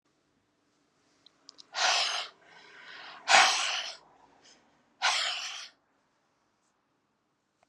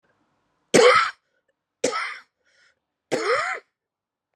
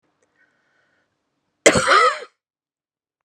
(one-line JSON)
{"exhalation_length": "7.7 s", "exhalation_amplitude": 18314, "exhalation_signal_mean_std_ratio": 0.34, "three_cough_length": "4.4 s", "three_cough_amplitude": 28490, "three_cough_signal_mean_std_ratio": 0.35, "cough_length": "3.2 s", "cough_amplitude": 32768, "cough_signal_mean_std_ratio": 0.3, "survey_phase": "beta (2021-08-13 to 2022-03-07)", "age": "45-64", "gender": "Female", "wearing_mask": "No", "symptom_cough_any": true, "symptom_fatigue": true, "symptom_change_to_sense_of_smell_or_taste": true, "symptom_onset": "4 days", "smoker_status": "Ex-smoker", "respiratory_condition_asthma": false, "respiratory_condition_other": false, "recruitment_source": "Test and Trace", "submission_delay": "2 days", "covid_test_result": "Positive", "covid_test_method": "RT-qPCR", "covid_ct_value": 19.0, "covid_ct_gene": "ORF1ab gene"}